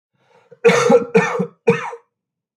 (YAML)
cough_length: 2.6 s
cough_amplitude: 27097
cough_signal_mean_std_ratio: 0.46
survey_phase: beta (2021-08-13 to 2022-03-07)
age: 45-64
gender: Male
wearing_mask: 'No'
symptom_cough_any: true
symptom_runny_or_blocked_nose: true
symptom_sore_throat: true
symptom_headache: true
symptom_onset: 3 days
smoker_status: Never smoked
respiratory_condition_asthma: false
respiratory_condition_other: false
recruitment_source: Test and Trace
submission_delay: 2 days
covid_test_result: Positive
covid_test_method: RT-qPCR
covid_ct_value: 35.4
covid_ct_gene: N gene